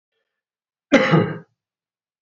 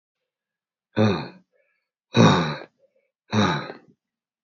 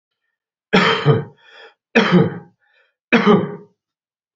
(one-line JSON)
{"cough_length": "2.2 s", "cough_amplitude": 27406, "cough_signal_mean_std_ratio": 0.33, "exhalation_length": "4.4 s", "exhalation_amplitude": 23324, "exhalation_signal_mean_std_ratio": 0.37, "three_cough_length": "4.4 s", "three_cough_amplitude": 29632, "three_cough_signal_mean_std_ratio": 0.43, "survey_phase": "beta (2021-08-13 to 2022-03-07)", "age": "45-64", "gender": "Male", "wearing_mask": "No", "symptom_runny_or_blocked_nose": true, "smoker_status": "Never smoked", "respiratory_condition_asthma": false, "respiratory_condition_other": false, "recruitment_source": "Test and Trace", "submission_delay": "2 days", "covid_test_result": "Positive", "covid_test_method": "RT-qPCR", "covid_ct_value": 16.3, "covid_ct_gene": "ORF1ab gene", "covid_ct_mean": 16.7, "covid_viral_load": "3300000 copies/ml", "covid_viral_load_category": "High viral load (>1M copies/ml)"}